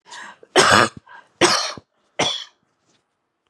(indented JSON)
{
  "three_cough_length": "3.5 s",
  "three_cough_amplitude": 32758,
  "three_cough_signal_mean_std_ratio": 0.38,
  "survey_phase": "beta (2021-08-13 to 2022-03-07)",
  "age": "45-64",
  "gender": "Female",
  "wearing_mask": "No",
  "symptom_none": true,
  "smoker_status": "Never smoked",
  "respiratory_condition_asthma": false,
  "respiratory_condition_other": false,
  "recruitment_source": "REACT",
  "submission_delay": "1 day",
  "covid_test_result": "Negative",
  "covid_test_method": "RT-qPCR"
}